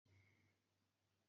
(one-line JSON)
{"cough_length": "1.3 s", "cough_amplitude": 24, "cough_signal_mean_std_ratio": 0.75, "survey_phase": "beta (2021-08-13 to 2022-03-07)", "age": "65+", "gender": "Female", "wearing_mask": "No", "symptom_change_to_sense_of_smell_or_taste": true, "symptom_loss_of_taste": true, "smoker_status": "Never smoked", "respiratory_condition_asthma": false, "respiratory_condition_other": false, "recruitment_source": "REACT", "submission_delay": "0 days", "covid_test_result": "Negative", "covid_test_method": "RT-qPCR", "influenza_a_test_result": "Negative", "influenza_b_test_result": "Negative"}